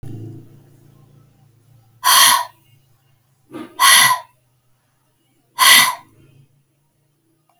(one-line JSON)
{"exhalation_length": "7.6 s", "exhalation_amplitude": 32768, "exhalation_signal_mean_std_ratio": 0.33, "survey_phase": "beta (2021-08-13 to 2022-03-07)", "age": "65+", "gender": "Female", "wearing_mask": "Yes", "symptom_cough_any": true, "symptom_runny_or_blocked_nose": true, "symptom_diarrhoea": true, "symptom_headache": true, "symptom_other": true, "symptom_onset": "3 days", "smoker_status": "Never smoked", "respiratory_condition_asthma": false, "respiratory_condition_other": false, "recruitment_source": "Test and Trace", "submission_delay": "1 day", "covid_test_result": "Positive", "covid_test_method": "RT-qPCR", "covid_ct_value": 23.8, "covid_ct_gene": "ORF1ab gene"}